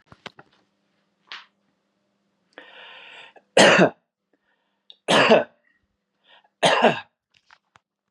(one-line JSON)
{"three_cough_length": "8.1 s", "three_cough_amplitude": 29943, "three_cough_signal_mean_std_ratio": 0.28, "survey_phase": "beta (2021-08-13 to 2022-03-07)", "age": "45-64", "gender": "Male", "wearing_mask": "No", "symptom_none": true, "smoker_status": "Never smoked", "respiratory_condition_asthma": false, "respiratory_condition_other": false, "recruitment_source": "Test and Trace", "submission_delay": "1 day", "covid_test_result": "Positive", "covid_test_method": "RT-qPCR", "covid_ct_value": 25.7, "covid_ct_gene": "ORF1ab gene"}